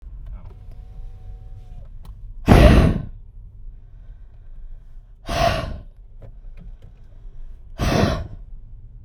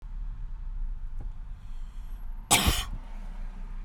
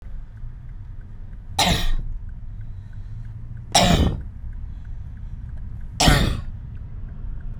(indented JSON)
{
  "exhalation_length": "9.0 s",
  "exhalation_amplitude": 32768,
  "exhalation_signal_mean_std_ratio": 0.42,
  "cough_length": "3.8 s",
  "cough_amplitude": 17266,
  "cough_signal_mean_std_ratio": 0.88,
  "three_cough_length": "7.6 s",
  "three_cough_amplitude": 29877,
  "three_cough_signal_mean_std_ratio": 0.66,
  "survey_phase": "beta (2021-08-13 to 2022-03-07)",
  "age": "18-44",
  "gender": "Female",
  "wearing_mask": "No",
  "symptom_runny_or_blocked_nose": true,
  "symptom_fatigue": true,
  "smoker_status": "Never smoked",
  "respiratory_condition_asthma": false,
  "respiratory_condition_other": false,
  "recruitment_source": "REACT",
  "submission_delay": "0 days",
  "covid_test_result": "Negative",
  "covid_test_method": "RT-qPCR"
}